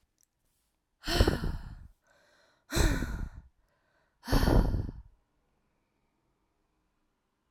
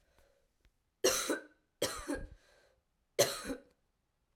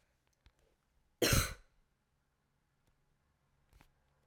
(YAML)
exhalation_length: 7.5 s
exhalation_amplitude: 12151
exhalation_signal_mean_std_ratio: 0.36
three_cough_length: 4.4 s
three_cough_amplitude: 6738
three_cough_signal_mean_std_ratio: 0.35
cough_length: 4.3 s
cough_amplitude: 4495
cough_signal_mean_std_ratio: 0.21
survey_phase: alpha (2021-03-01 to 2021-08-12)
age: 18-44
gender: Female
wearing_mask: 'No'
symptom_cough_any: true
symptom_new_continuous_cough: true
symptom_shortness_of_breath: true
symptom_fatigue: true
symptom_headache: true
symptom_change_to_sense_of_smell_or_taste: true
symptom_loss_of_taste: true
symptom_onset: 3 days
smoker_status: Never smoked
respiratory_condition_asthma: false
respiratory_condition_other: false
recruitment_source: Test and Trace
submission_delay: 2 days
covid_test_result: Positive
covid_test_method: RT-qPCR